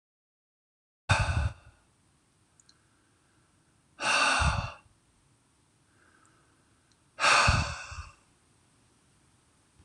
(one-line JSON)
{"exhalation_length": "9.8 s", "exhalation_amplitude": 9657, "exhalation_signal_mean_std_ratio": 0.34, "survey_phase": "alpha (2021-03-01 to 2021-08-12)", "age": "45-64", "gender": "Male", "wearing_mask": "No", "symptom_none": true, "smoker_status": "Never smoked", "respiratory_condition_asthma": false, "respiratory_condition_other": false, "recruitment_source": "REACT", "submission_delay": "1 day", "covid_test_result": "Negative", "covid_test_method": "RT-qPCR"}